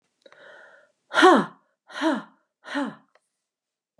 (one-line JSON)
{"exhalation_length": "4.0 s", "exhalation_amplitude": 25594, "exhalation_signal_mean_std_ratio": 0.29, "survey_phase": "alpha (2021-03-01 to 2021-08-12)", "age": "45-64", "gender": "Female", "wearing_mask": "No", "symptom_none": true, "smoker_status": "Never smoked", "respiratory_condition_asthma": false, "respiratory_condition_other": false, "recruitment_source": "REACT", "submission_delay": "3 days", "covid_test_result": "Negative", "covid_test_method": "RT-qPCR"}